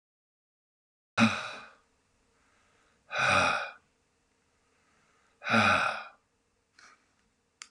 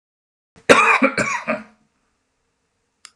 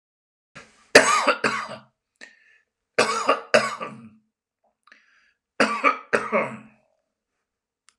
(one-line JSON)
{"exhalation_length": "7.7 s", "exhalation_amplitude": 10117, "exhalation_signal_mean_std_ratio": 0.33, "cough_length": "3.2 s", "cough_amplitude": 32768, "cough_signal_mean_std_ratio": 0.35, "three_cough_length": "8.0 s", "three_cough_amplitude": 32768, "three_cough_signal_mean_std_ratio": 0.34, "survey_phase": "alpha (2021-03-01 to 2021-08-12)", "age": "45-64", "gender": "Male", "wearing_mask": "No", "symptom_none": true, "smoker_status": "Never smoked", "respiratory_condition_asthma": false, "respiratory_condition_other": false, "recruitment_source": "REACT", "submission_delay": "2 days", "covid_test_result": "Negative", "covid_test_method": "RT-qPCR"}